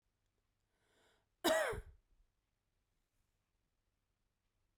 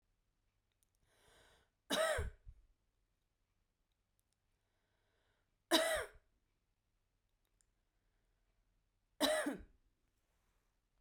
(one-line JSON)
{"cough_length": "4.8 s", "cough_amplitude": 3053, "cough_signal_mean_std_ratio": 0.23, "three_cough_length": "11.0 s", "three_cough_amplitude": 5152, "three_cough_signal_mean_std_ratio": 0.26, "survey_phase": "beta (2021-08-13 to 2022-03-07)", "age": "45-64", "gender": "Female", "wearing_mask": "No", "symptom_none": true, "smoker_status": "Never smoked", "respiratory_condition_asthma": true, "respiratory_condition_other": false, "recruitment_source": "REACT", "submission_delay": "2 days", "covid_test_result": "Negative", "covid_test_method": "RT-qPCR"}